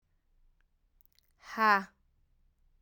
exhalation_length: 2.8 s
exhalation_amplitude: 7132
exhalation_signal_mean_std_ratio: 0.24
survey_phase: alpha (2021-03-01 to 2021-08-12)
age: 18-44
gender: Female
wearing_mask: 'No'
symptom_cough_any: true
symptom_new_continuous_cough: true
symptom_diarrhoea: true
symptom_fatigue: true
symptom_headache: true
symptom_change_to_sense_of_smell_or_taste: true
symptom_onset: 5 days
smoker_status: Ex-smoker
respiratory_condition_asthma: false
respiratory_condition_other: false
recruitment_source: Test and Trace
submission_delay: 1 day
covid_test_result: Positive
covid_test_method: RT-qPCR
covid_ct_value: 11.9
covid_ct_gene: ORF1ab gene
covid_ct_mean: 12.2
covid_viral_load: 97000000 copies/ml
covid_viral_load_category: High viral load (>1M copies/ml)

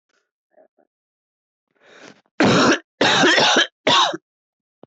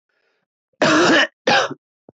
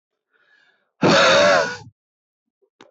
three_cough_length: 4.9 s
three_cough_amplitude: 22950
three_cough_signal_mean_std_ratio: 0.45
cough_length: 2.1 s
cough_amplitude: 22619
cough_signal_mean_std_ratio: 0.5
exhalation_length: 2.9 s
exhalation_amplitude: 21009
exhalation_signal_mean_std_ratio: 0.43
survey_phase: beta (2021-08-13 to 2022-03-07)
age: 18-44
gender: Male
wearing_mask: 'No'
symptom_cough_any: true
symptom_fatigue: true
symptom_fever_high_temperature: true
symptom_headache: true
symptom_other: true
smoker_status: Never smoked
respiratory_condition_asthma: false
respiratory_condition_other: false
recruitment_source: Test and Trace
submission_delay: 2 days
covid_test_result: Positive
covid_test_method: RT-qPCR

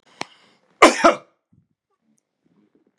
cough_length: 3.0 s
cough_amplitude: 32768
cough_signal_mean_std_ratio: 0.22
survey_phase: beta (2021-08-13 to 2022-03-07)
age: 65+
gender: Male
wearing_mask: 'No'
symptom_none: true
smoker_status: Ex-smoker
respiratory_condition_asthma: false
respiratory_condition_other: false
recruitment_source: REACT
submission_delay: 1 day
covid_test_result: Negative
covid_test_method: RT-qPCR
influenza_a_test_result: Negative
influenza_b_test_result: Negative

